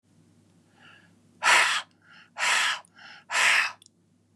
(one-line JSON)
{"exhalation_length": "4.4 s", "exhalation_amplitude": 14343, "exhalation_signal_mean_std_ratio": 0.44, "survey_phase": "beta (2021-08-13 to 2022-03-07)", "age": "45-64", "gender": "Male", "wearing_mask": "No", "symptom_none": true, "smoker_status": "Ex-smoker", "respiratory_condition_asthma": false, "respiratory_condition_other": false, "recruitment_source": "REACT", "submission_delay": "2 days", "covid_test_result": "Negative", "covid_test_method": "RT-qPCR", "influenza_a_test_result": "Negative", "influenza_b_test_result": "Negative"}